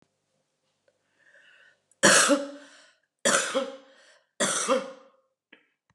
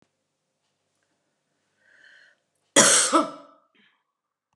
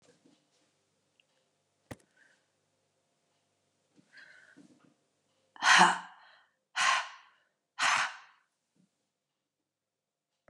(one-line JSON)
{"three_cough_length": "5.9 s", "three_cough_amplitude": 19992, "three_cough_signal_mean_std_ratio": 0.36, "cough_length": "4.6 s", "cough_amplitude": 25955, "cough_signal_mean_std_ratio": 0.26, "exhalation_length": "10.5 s", "exhalation_amplitude": 12822, "exhalation_signal_mean_std_ratio": 0.23, "survey_phase": "beta (2021-08-13 to 2022-03-07)", "age": "45-64", "gender": "Female", "wearing_mask": "No", "symptom_cough_any": true, "symptom_sore_throat": true, "symptom_loss_of_taste": true, "symptom_other": true, "symptom_onset": "9 days", "smoker_status": "Ex-smoker", "respiratory_condition_asthma": false, "respiratory_condition_other": false, "recruitment_source": "Test and Trace", "submission_delay": "1 day", "covid_test_result": "Negative", "covid_test_method": "RT-qPCR"}